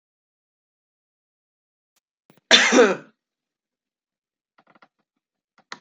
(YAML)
cough_length: 5.8 s
cough_amplitude: 32043
cough_signal_mean_std_ratio: 0.21
survey_phase: beta (2021-08-13 to 2022-03-07)
age: 45-64
gender: Female
wearing_mask: 'No'
symptom_cough_any: true
symptom_fatigue: true
symptom_change_to_sense_of_smell_or_taste: true
symptom_onset: 10 days
smoker_status: Ex-smoker
respiratory_condition_asthma: false
respiratory_condition_other: false
recruitment_source: Test and Trace
submission_delay: 2 days
covid_test_result: Positive
covid_test_method: RT-qPCR
covid_ct_value: 29.8
covid_ct_gene: ORF1ab gene